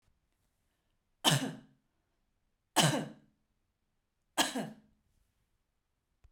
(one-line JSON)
{"three_cough_length": "6.3 s", "three_cough_amplitude": 7628, "three_cough_signal_mean_std_ratio": 0.27, "survey_phase": "beta (2021-08-13 to 2022-03-07)", "age": "45-64", "gender": "Female", "wearing_mask": "No", "symptom_none": true, "smoker_status": "Ex-smoker", "respiratory_condition_asthma": true, "respiratory_condition_other": false, "recruitment_source": "REACT", "submission_delay": "1 day", "covid_test_result": "Negative", "covid_test_method": "RT-qPCR"}